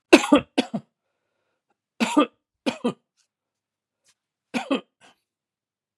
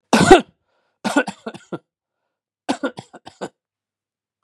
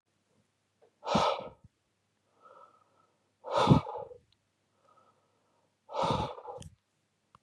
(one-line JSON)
{"three_cough_length": "6.0 s", "three_cough_amplitude": 32767, "three_cough_signal_mean_std_ratio": 0.25, "cough_length": "4.4 s", "cough_amplitude": 32768, "cough_signal_mean_std_ratio": 0.26, "exhalation_length": "7.4 s", "exhalation_amplitude": 11007, "exhalation_signal_mean_std_ratio": 0.3, "survey_phase": "beta (2021-08-13 to 2022-03-07)", "age": "65+", "gender": "Male", "wearing_mask": "No", "symptom_none": true, "smoker_status": "Ex-smoker", "respiratory_condition_asthma": false, "respiratory_condition_other": false, "recruitment_source": "REACT", "submission_delay": "0 days", "covid_test_result": "Negative", "covid_test_method": "RT-qPCR", "influenza_a_test_result": "Unknown/Void", "influenza_b_test_result": "Unknown/Void"}